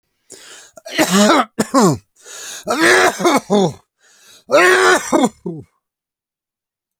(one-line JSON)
{"three_cough_length": "7.0 s", "three_cough_amplitude": 32429, "three_cough_signal_mean_std_ratio": 0.52, "survey_phase": "alpha (2021-03-01 to 2021-08-12)", "age": "65+", "gender": "Male", "wearing_mask": "No", "symptom_none": true, "smoker_status": "Never smoked", "respiratory_condition_asthma": false, "respiratory_condition_other": false, "recruitment_source": "REACT", "submission_delay": "1 day", "covid_test_result": "Negative", "covid_test_method": "RT-qPCR"}